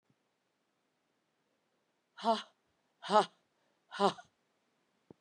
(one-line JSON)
{"exhalation_length": "5.2 s", "exhalation_amplitude": 7070, "exhalation_signal_mean_std_ratio": 0.21, "survey_phase": "beta (2021-08-13 to 2022-03-07)", "age": "45-64", "gender": "Female", "wearing_mask": "No", "symptom_cough_any": true, "symptom_runny_or_blocked_nose": true, "symptom_sore_throat": true, "symptom_diarrhoea": true, "symptom_headache": true, "symptom_other": true, "symptom_onset": "5 days", "smoker_status": "Ex-smoker", "respiratory_condition_asthma": false, "respiratory_condition_other": false, "recruitment_source": "Test and Trace", "submission_delay": "2 days", "covid_test_result": "Positive", "covid_test_method": "RT-qPCR", "covid_ct_value": 22.3, "covid_ct_gene": "N gene"}